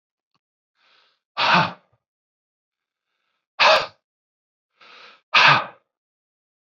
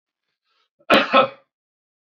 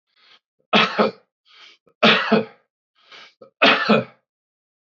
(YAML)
exhalation_length: 6.7 s
exhalation_amplitude: 25844
exhalation_signal_mean_std_ratio: 0.28
cough_length: 2.1 s
cough_amplitude: 24462
cough_signal_mean_std_ratio: 0.3
three_cough_length: 4.9 s
three_cough_amplitude: 26462
three_cough_signal_mean_std_ratio: 0.38
survey_phase: beta (2021-08-13 to 2022-03-07)
age: 45-64
gender: Male
wearing_mask: 'No'
symptom_none: true
symptom_onset: 8 days
smoker_status: Ex-smoker
respiratory_condition_asthma: true
respiratory_condition_other: false
recruitment_source: REACT
submission_delay: 1 day
covid_test_result: Negative
covid_test_method: RT-qPCR
influenza_a_test_result: Negative
influenza_b_test_result: Negative